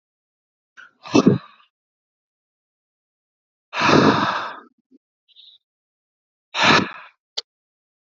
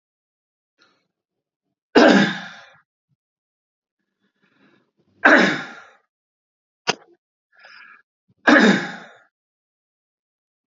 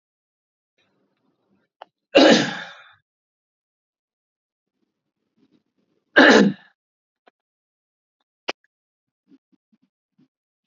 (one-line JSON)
{"exhalation_length": "8.1 s", "exhalation_amplitude": 27356, "exhalation_signal_mean_std_ratio": 0.3, "three_cough_length": "10.7 s", "three_cough_amplitude": 32767, "three_cough_signal_mean_std_ratio": 0.26, "cough_length": "10.7 s", "cough_amplitude": 32768, "cough_signal_mean_std_ratio": 0.21, "survey_phase": "alpha (2021-03-01 to 2021-08-12)", "age": "45-64", "gender": "Male", "wearing_mask": "No", "symptom_none": true, "smoker_status": "Never smoked", "recruitment_source": "Test and Trace", "submission_delay": "-1 day", "covid_test_result": "Negative", "covid_test_method": "LFT"}